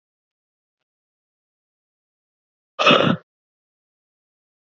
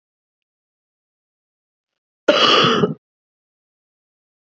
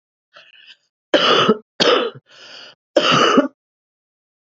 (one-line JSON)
{"exhalation_length": "4.8 s", "exhalation_amplitude": 28750, "exhalation_signal_mean_std_ratio": 0.21, "cough_length": "4.5 s", "cough_amplitude": 29548, "cough_signal_mean_std_ratio": 0.29, "three_cough_length": "4.4 s", "three_cough_amplitude": 31580, "three_cough_signal_mean_std_ratio": 0.44, "survey_phase": "beta (2021-08-13 to 2022-03-07)", "age": "45-64", "gender": "Female", "wearing_mask": "No", "symptom_runny_or_blocked_nose": true, "symptom_headache": true, "symptom_onset": "13 days", "smoker_status": "Current smoker (11 or more cigarettes per day)", "respiratory_condition_asthma": false, "respiratory_condition_other": false, "recruitment_source": "REACT", "submission_delay": "1 day", "covid_test_result": "Negative", "covid_test_method": "RT-qPCR", "influenza_a_test_result": "Negative", "influenza_b_test_result": "Negative"}